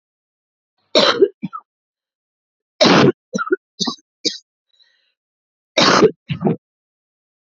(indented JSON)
{
  "three_cough_length": "7.5 s",
  "three_cough_amplitude": 32767,
  "three_cough_signal_mean_std_ratio": 0.35,
  "survey_phase": "alpha (2021-03-01 to 2021-08-12)",
  "age": "18-44",
  "gender": "Female",
  "wearing_mask": "No",
  "symptom_new_continuous_cough": true,
  "symptom_shortness_of_breath": true,
  "symptom_diarrhoea": true,
  "symptom_headache": true,
  "symptom_change_to_sense_of_smell_or_taste": true,
  "symptom_loss_of_taste": true,
  "symptom_onset": "6 days",
  "smoker_status": "Current smoker (11 or more cigarettes per day)",
  "respiratory_condition_asthma": false,
  "respiratory_condition_other": false,
  "recruitment_source": "Test and Trace",
  "submission_delay": "3 days",
  "covid_test_result": "Positive",
  "covid_test_method": "RT-qPCR",
  "covid_ct_value": 27.8,
  "covid_ct_gene": "ORF1ab gene"
}